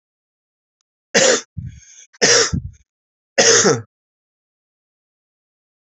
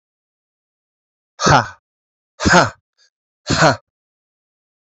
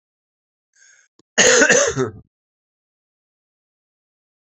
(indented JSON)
{
  "three_cough_length": "5.9 s",
  "three_cough_amplitude": 32768,
  "three_cough_signal_mean_std_ratio": 0.35,
  "exhalation_length": "4.9 s",
  "exhalation_amplitude": 31382,
  "exhalation_signal_mean_std_ratio": 0.3,
  "cough_length": "4.4 s",
  "cough_amplitude": 30817,
  "cough_signal_mean_std_ratio": 0.31,
  "survey_phase": "beta (2021-08-13 to 2022-03-07)",
  "age": "45-64",
  "gender": "Male",
  "wearing_mask": "No",
  "symptom_cough_any": true,
  "symptom_runny_or_blocked_nose": true,
  "symptom_sore_throat": true,
  "symptom_fatigue": true,
  "symptom_headache": true,
  "symptom_change_to_sense_of_smell_or_taste": true,
  "smoker_status": "Ex-smoker",
  "respiratory_condition_asthma": false,
  "respiratory_condition_other": false,
  "recruitment_source": "Test and Trace",
  "submission_delay": "1 day",
  "covid_test_result": "Positive",
  "covid_test_method": "LFT"
}